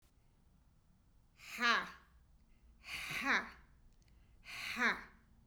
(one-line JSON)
{"exhalation_length": "5.5 s", "exhalation_amplitude": 4397, "exhalation_signal_mean_std_ratio": 0.39, "survey_phase": "beta (2021-08-13 to 2022-03-07)", "age": "45-64", "gender": "Female", "wearing_mask": "No", "symptom_cough_any": true, "symptom_runny_or_blocked_nose": true, "symptom_sore_throat": true, "symptom_fatigue": true, "symptom_headache": true, "smoker_status": "Never smoked", "respiratory_condition_asthma": true, "respiratory_condition_other": false, "recruitment_source": "Test and Trace", "submission_delay": "2 days", "covid_test_result": "Positive", "covid_test_method": "ePCR"}